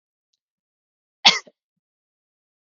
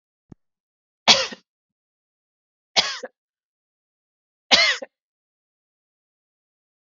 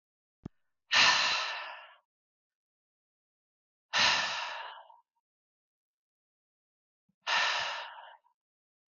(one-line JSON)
{"cough_length": "2.7 s", "cough_amplitude": 32766, "cough_signal_mean_std_ratio": 0.14, "three_cough_length": "6.8 s", "three_cough_amplitude": 32768, "three_cough_signal_mean_std_ratio": 0.21, "exhalation_length": "8.9 s", "exhalation_amplitude": 9200, "exhalation_signal_mean_std_ratio": 0.36, "survey_phase": "beta (2021-08-13 to 2022-03-07)", "age": "18-44", "gender": "Female", "wearing_mask": "No", "symptom_none": true, "smoker_status": "Never smoked", "respiratory_condition_asthma": false, "respiratory_condition_other": false, "recruitment_source": "REACT", "submission_delay": "3 days", "covid_test_result": "Negative", "covid_test_method": "RT-qPCR"}